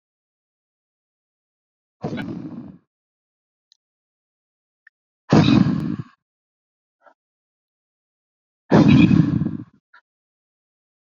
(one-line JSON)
{"exhalation_length": "11.0 s", "exhalation_amplitude": 25716, "exhalation_signal_mean_std_ratio": 0.29, "survey_phase": "alpha (2021-03-01 to 2021-08-12)", "age": "45-64", "gender": "Male", "wearing_mask": "No", "symptom_cough_any": true, "symptom_fatigue": true, "symptom_headache": true, "symptom_onset": "6 days", "smoker_status": "Ex-smoker", "respiratory_condition_asthma": true, "respiratory_condition_other": true, "recruitment_source": "Test and Trace", "submission_delay": "3 days", "covid_test_result": "Positive", "covid_test_method": "RT-qPCR"}